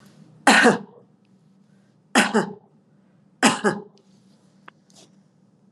{
  "three_cough_length": "5.7 s",
  "three_cough_amplitude": 29902,
  "three_cough_signal_mean_std_ratio": 0.31,
  "survey_phase": "alpha (2021-03-01 to 2021-08-12)",
  "age": "45-64",
  "gender": "Female",
  "wearing_mask": "Yes",
  "symptom_none": true,
  "smoker_status": "Never smoked",
  "respiratory_condition_asthma": false,
  "respiratory_condition_other": false,
  "recruitment_source": "Test and Trace",
  "submission_delay": "0 days",
  "covid_test_result": "Negative",
  "covid_test_method": "LFT"
}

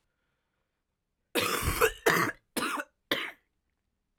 {
  "three_cough_length": "4.2 s",
  "three_cough_amplitude": 11033,
  "three_cough_signal_mean_std_ratio": 0.42,
  "survey_phase": "alpha (2021-03-01 to 2021-08-12)",
  "age": "18-44",
  "gender": "Female",
  "wearing_mask": "No",
  "symptom_cough_any": true,
  "symptom_new_continuous_cough": true,
  "symptom_shortness_of_breath": true,
  "symptom_fatigue": true,
  "symptom_fever_high_temperature": true,
  "symptom_headache": true,
  "symptom_change_to_sense_of_smell_or_taste": true,
  "symptom_loss_of_taste": true,
  "symptom_onset": "5 days",
  "smoker_status": "Never smoked",
  "respiratory_condition_asthma": false,
  "respiratory_condition_other": false,
  "recruitment_source": "Test and Trace",
  "submission_delay": "2 days",
  "covid_test_result": "Positive",
  "covid_test_method": "RT-qPCR",
  "covid_ct_value": 23.0,
  "covid_ct_gene": "N gene"
}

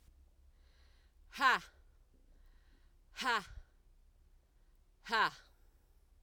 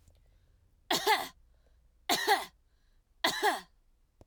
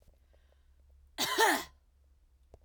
{
  "exhalation_length": "6.2 s",
  "exhalation_amplitude": 5513,
  "exhalation_signal_mean_std_ratio": 0.29,
  "three_cough_length": "4.3 s",
  "three_cough_amplitude": 8971,
  "three_cough_signal_mean_std_ratio": 0.39,
  "cough_length": "2.6 s",
  "cough_amplitude": 7112,
  "cough_signal_mean_std_ratio": 0.33,
  "survey_phase": "alpha (2021-03-01 to 2021-08-12)",
  "age": "18-44",
  "gender": "Female",
  "wearing_mask": "No",
  "symptom_none": true,
  "smoker_status": "Never smoked",
  "respiratory_condition_asthma": false,
  "respiratory_condition_other": false,
  "recruitment_source": "REACT",
  "submission_delay": "1 day",
  "covid_test_result": "Negative",
  "covid_test_method": "RT-qPCR"
}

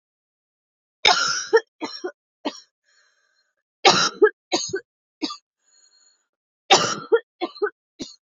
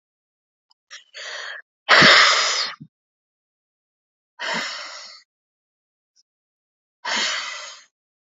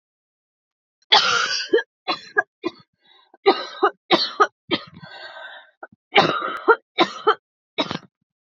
{
  "three_cough_length": "8.3 s",
  "three_cough_amplitude": 32767,
  "three_cough_signal_mean_std_ratio": 0.32,
  "exhalation_length": "8.4 s",
  "exhalation_amplitude": 32190,
  "exhalation_signal_mean_std_ratio": 0.33,
  "cough_length": "8.4 s",
  "cough_amplitude": 31682,
  "cough_signal_mean_std_ratio": 0.38,
  "survey_phase": "beta (2021-08-13 to 2022-03-07)",
  "age": "18-44",
  "gender": "Female",
  "wearing_mask": "No",
  "symptom_cough_any": true,
  "symptom_runny_or_blocked_nose": true,
  "symptom_sore_throat": true,
  "symptom_fatigue": true,
  "symptom_headache": true,
  "symptom_other": true,
  "symptom_onset": "4 days",
  "smoker_status": "Ex-smoker",
  "respiratory_condition_asthma": false,
  "respiratory_condition_other": false,
  "recruitment_source": "Test and Trace",
  "submission_delay": "2 days",
  "covid_test_result": "Positive",
  "covid_test_method": "RT-qPCR",
  "covid_ct_value": 17.3,
  "covid_ct_gene": "ORF1ab gene"
}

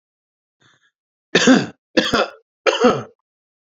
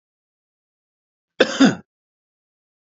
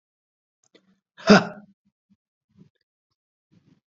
{
  "three_cough_length": "3.7 s",
  "three_cough_amplitude": 30478,
  "three_cough_signal_mean_std_ratio": 0.38,
  "cough_length": "3.0 s",
  "cough_amplitude": 32768,
  "cough_signal_mean_std_ratio": 0.22,
  "exhalation_length": "3.9 s",
  "exhalation_amplitude": 27734,
  "exhalation_signal_mean_std_ratio": 0.16,
  "survey_phase": "beta (2021-08-13 to 2022-03-07)",
  "age": "45-64",
  "gender": "Male",
  "wearing_mask": "No",
  "symptom_runny_or_blocked_nose": true,
  "symptom_fatigue": true,
  "smoker_status": "Never smoked",
  "respiratory_condition_asthma": true,
  "respiratory_condition_other": false,
  "recruitment_source": "Test and Trace",
  "submission_delay": "1 day",
  "covid_test_result": "Positive",
  "covid_test_method": "RT-qPCR",
  "covid_ct_value": 19.7,
  "covid_ct_gene": "ORF1ab gene",
  "covid_ct_mean": 20.2,
  "covid_viral_load": "240000 copies/ml",
  "covid_viral_load_category": "Low viral load (10K-1M copies/ml)"
}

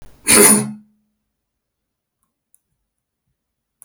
{
  "cough_length": "3.8 s",
  "cough_amplitude": 32768,
  "cough_signal_mean_std_ratio": 0.26,
  "survey_phase": "beta (2021-08-13 to 2022-03-07)",
  "age": "65+",
  "gender": "Male",
  "wearing_mask": "No",
  "symptom_cough_any": true,
  "smoker_status": "Never smoked",
  "respiratory_condition_asthma": false,
  "respiratory_condition_other": false,
  "recruitment_source": "REACT",
  "submission_delay": "1 day",
  "covid_test_result": "Negative",
  "covid_test_method": "RT-qPCR",
  "influenza_a_test_result": "Negative",
  "influenza_b_test_result": "Negative"
}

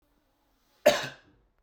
{
  "cough_length": "1.6 s",
  "cough_amplitude": 14495,
  "cough_signal_mean_std_ratio": 0.24,
  "survey_phase": "beta (2021-08-13 to 2022-03-07)",
  "age": "18-44",
  "gender": "Male",
  "wearing_mask": "No",
  "symptom_runny_or_blocked_nose": true,
  "symptom_onset": "4 days",
  "smoker_status": "Never smoked",
  "respiratory_condition_asthma": false,
  "respiratory_condition_other": false,
  "recruitment_source": "Test and Trace",
  "submission_delay": "2 days",
  "covid_test_result": "Positive",
  "covid_test_method": "ePCR"
}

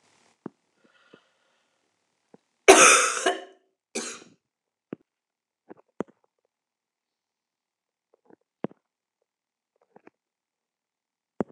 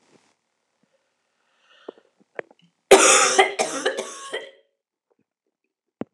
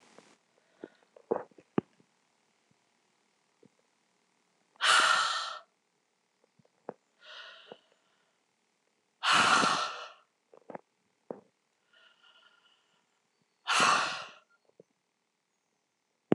{
  "cough_length": "11.5 s",
  "cough_amplitude": 26028,
  "cough_signal_mean_std_ratio": 0.18,
  "three_cough_length": "6.1 s",
  "three_cough_amplitude": 26028,
  "three_cough_signal_mean_std_ratio": 0.29,
  "exhalation_length": "16.3 s",
  "exhalation_amplitude": 10925,
  "exhalation_signal_mean_std_ratio": 0.29,
  "survey_phase": "alpha (2021-03-01 to 2021-08-12)",
  "age": "45-64",
  "gender": "Female",
  "wearing_mask": "No",
  "symptom_cough_any": true,
  "symptom_shortness_of_breath": true,
  "symptom_fatigue": true,
  "symptom_change_to_sense_of_smell_or_taste": true,
  "symptom_loss_of_taste": true,
  "symptom_onset": "4 days",
  "smoker_status": "Never smoked",
  "respiratory_condition_asthma": true,
  "respiratory_condition_other": false,
  "recruitment_source": "Test and Trace",
  "submission_delay": "1 day",
  "covid_test_result": "Positive",
  "covid_test_method": "RT-qPCR"
}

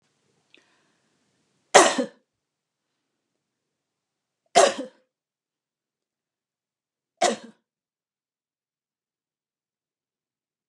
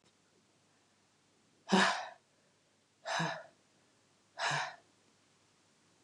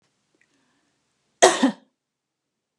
{
  "three_cough_length": "10.7 s",
  "three_cough_amplitude": 32648,
  "three_cough_signal_mean_std_ratio": 0.17,
  "exhalation_length": "6.0 s",
  "exhalation_amplitude": 5431,
  "exhalation_signal_mean_std_ratio": 0.32,
  "cough_length": "2.8 s",
  "cough_amplitude": 32767,
  "cough_signal_mean_std_ratio": 0.22,
  "survey_phase": "beta (2021-08-13 to 2022-03-07)",
  "age": "45-64",
  "gender": "Female",
  "wearing_mask": "No",
  "symptom_cough_any": true,
  "smoker_status": "Never smoked",
  "respiratory_condition_asthma": false,
  "respiratory_condition_other": false,
  "recruitment_source": "REACT",
  "submission_delay": "1 day",
  "covid_test_result": "Negative",
  "covid_test_method": "RT-qPCR",
  "influenza_a_test_result": "Negative",
  "influenza_b_test_result": "Negative"
}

